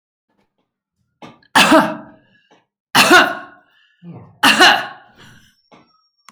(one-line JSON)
{"three_cough_length": "6.3 s", "three_cough_amplitude": 32767, "three_cough_signal_mean_std_ratio": 0.36, "survey_phase": "alpha (2021-03-01 to 2021-08-12)", "age": "45-64", "gender": "Female", "wearing_mask": "No", "symptom_none": true, "smoker_status": "Ex-smoker", "respiratory_condition_asthma": false, "respiratory_condition_other": false, "recruitment_source": "REACT", "submission_delay": "3 days", "covid_test_result": "Negative", "covid_test_method": "RT-qPCR"}